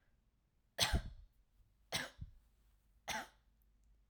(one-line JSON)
{"three_cough_length": "4.1 s", "three_cough_amplitude": 3938, "three_cough_signal_mean_std_ratio": 0.32, "survey_phase": "alpha (2021-03-01 to 2021-08-12)", "age": "18-44", "gender": "Female", "wearing_mask": "No", "symptom_none": true, "smoker_status": "Never smoked", "respiratory_condition_asthma": false, "respiratory_condition_other": false, "recruitment_source": "REACT", "submission_delay": "1 day", "covid_test_result": "Negative", "covid_test_method": "RT-qPCR"}